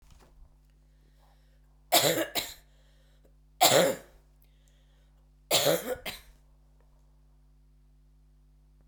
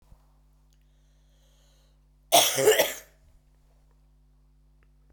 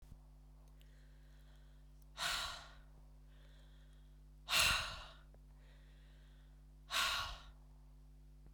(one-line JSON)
{"three_cough_length": "8.9 s", "three_cough_amplitude": 15029, "three_cough_signal_mean_std_ratio": 0.32, "cough_length": "5.1 s", "cough_amplitude": 20120, "cough_signal_mean_std_ratio": 0.27, "exhalation_length": "8.5 s", "exhalation_amplitude": 3681, "exhalation_signal_mean_std_ratio": 0.46, "survey_phase": "beta (2021-08-13 to 2022-03-07)", "age": "45-64", "gender": "Female", "wearing_mask": "No", "symptom_cough_any": true, "symptom_runny_or_blocked_nose": true, "symptom_sore_throat": true, "symptom_diarrhoea": true, "symptom_fatigue": true, "symptom_headache": true, "smoker_status": "Never smoked", "respiratory_condition_asthma": false, "respiratory_condition_other": false, "recruitment_source": "Test and Trace", "submission_delay": "1 day", "covid_test_result": "Positive", "covid_test_method": "RT-qPCR", "covid_ct_value": 17.7, "covid_ct_gene": "ORF1ab gene"}